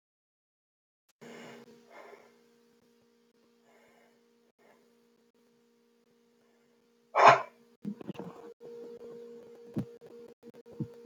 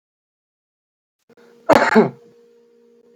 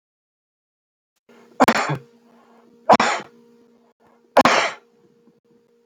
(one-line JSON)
{"exhalation_length": "11.1 s", "exhalation_amplitude": 19538, "exhalation_signal_mean_std_ratio": 0.19, "cough_length": "3.2 s", "cough_amplitude": 28633, "cough_signal_mean_std_ratio": 0.27, "three_cough_length": "5.9 s", "three_cough_amplitude": 28875, "three_cough_signal_mean_std_ratio": 0.29, "survey_phase": "beta (2021-08-13 to 2022-03-07)", "age": "45-64", "gender": "Male", "wearing_mask": "No", "symptom_sore_throat": true, "symptom_fatigue": true, "smoker_status": "Never smoked", "respiratory_condition_asthma": true, "respiratory_condition_other": false, "recruitment_source": "Test and Trace", "submission_delay": "1 day", "covid_test_result": "Positive", "covid_test_method": "LFT"}